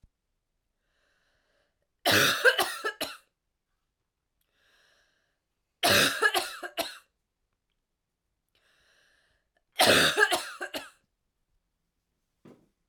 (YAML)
three_cough_length: 12.9 s
three_cough_amplitude: 15917
three_cough_signal_mean_std_ratio: 0.32
survey_phase: alpha (2021-03-01 to 2021-08-12)
age: 18-44
gender: Female
wearing_mask: 'No'
symptom_new_continuous_cough: true
symptom_shortness_of_breath: true
symptom_fatigue: true
symptom_onset: 3 days
smoker_status: Never smoked
respiratory_condition_asthma: false
respiratory_condition_other: false
recruitment_source: Test and Trace
submission_delay: 2 days
covid_test_result: Positive
covid_test_method: RT-qPCR
covid_ct_value: 24.4
covid_ct_gene: ORF1ab gene
covid_ct_mean: 25.2
covid_viral_load: 5400 copies/ml
covid_viral_load_category: Minimal viral load (< 10K copies/ml)